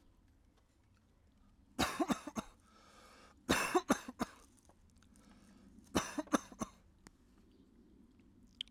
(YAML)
three_cough_length: 8.7 s
three_cough_amplitude: 5948
three_cough_signal_mean_std_ratio: 0.31
survey_phase: alpha (2021-03-01 to 2021-08-12)
age: 18-44
gender: Male
wearing_mask: 'Yes'
symptom_cough_any: true
symptom_new_continuous_cough: true
symptom_diarrhoea: true
symptom_fatigue: true
symptom_change_to_sense_of_smell_or_taste: true
symptom_onset: 4 days
smoker_status: Current smoker (11 or more cigarettes per day)
respiratory_condition_asthma: false
respiratory_condition_other: false
recruitment_source: Test and Trace
submission_delay: 2 days
covid_test_result: Positive
covid_test_method: RT-qPCR
covid_ct_value: 41.2
covid_ct_gene: N gene